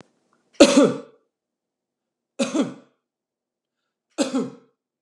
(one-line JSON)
{"three_cough_length": "5.0 s", "three_cough_amplitude": 32768, "three_cough_signal_mean_std_ratio": 0.28, "survey_phase": "alpha (2021-03-01 to 2021-08-12)", "age": "45-64", "gender": "Male", "wearing_mask": "No", "symptom_none": true, "smoker_status": "Ex-smoker", "respiratory_condition_asthma": false, "respiratory_condition_other": false, "recruitment_source": "REACT", "submission_delay": "2 days", "covid_test_result": "Negative", "covid_test_method": "RT-qPCR"}